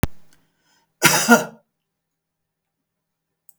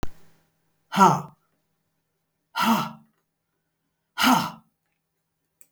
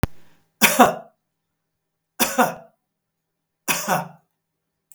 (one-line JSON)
{"cough_length": "3.6 s", "cough_amplitude": 32768, "cough_signal_mean_std_ratio": 0.27, "exhalation_length": "5.7 s", "exhalation_amplitude": 25801, "exhalation_signal_mean_std_ratio": 0.32, "three_cough_length": "4.9 s", "three_cough_amplitude": 32768, "three_cough_signal_mean_std_ratio": 0.32, "survey_phase": "beta (2021-08-13 to 2022-03-07)", "age": "65+", "gender": "Male", "wearing_mask": "No", "symptom_none": true, "smoker_status": "Ex-smoker", "respiratory_condition_asthma": false, "respiratory_condition_other": false, "recruitment_source": "REACT", "submission_delay": "3 days", "covid_test_result": "Negative", "covid_test_method": "RT-qPCR", "influenza_a_test_result": "Negative", "influenza_b_test_result": "Negative"}